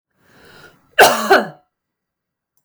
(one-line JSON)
{"cough_length": "2.6 s", "cough_amplitude": 32768, "cough_signal_mean_std_ratio": 0.31, "survey_phase": "beta (2021-08-13 to 2022-03-07)", "age": "18-44", "gender": "Female", "wearing_mask": "No", "symptom_none": true, "symptom_onset": "2 days", "smoker_status": "Ex-smoker", "respiratory_condition_asthma": false, "respiratory_condition_other": false, "recruitment_source": "REACT", "submission_delay": "4 days", "covid_test_result": "Negative", "covid_test_method": "RT-qPCR", "influenza_a_test_result": "Negative", "influenza_b_test_result": "Negative"}